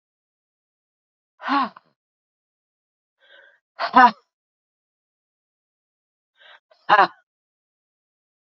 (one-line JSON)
{"exhalation_length": "8.4 s", "exhalation_amplitude": 32767, "exhalation_signal_mean_std_ratio": 0.19, "survey_phase": "beta (2021-08-13 to 2022-03-07)", "age": "45-64", "gender": "Female", "wearing_mask": "No", "symptom_none": true, "symptom_onset": "12 days", "smoker_status": "Prefer not to say", "respiratory_condition_asthma": true, "respiratory_condition_other": true, "recruitment_source": "REACT", "submission_delay": "6 days", "covid_test_result": "Negative", "covid_test_method": "RT-qPCR", "influenza_a_test_result": "Negative", "influenza_b_test_result": "Negative"}